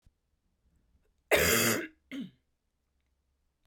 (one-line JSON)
{"cough_length": "3.7 s", "cough_amplitude": 10682, "cough_signal_mean_std_ratio": 0.33, "survey_phase": "beta (2021-08-13 to 2022-03-07)", "age": "18-44", "gender": "Female", "wearing_mask": "No", "symptom_cough_any": true, "symptom_new_continuous_cough": true, "symptom_runny_or_blocked_nose": true, "symptom_fatigue": true, "symptom_fever_high_temperature": true, "symptom_change_to_sense_of_smell_or_taste": true, "symptom_onset": "3 days", "smoker_status": "Never smoked", "respiratory_condition_asthma": true, "respiratory_condition_other": false, "recruitment_source": "Test and Trace", "submission_delay": "1 day", "covid_test_result": "Positive", "covid_test_method": "RT-qPCR", "covid_ct_value": 25.1, "covid_ct_gene": "ORF1ab gene", "covid_ct_mean": 28.9, "covid_viral_load": "320 copies/ml", "covid_viral_load_category": "Minimal viral load (< 10K copies/ml)"}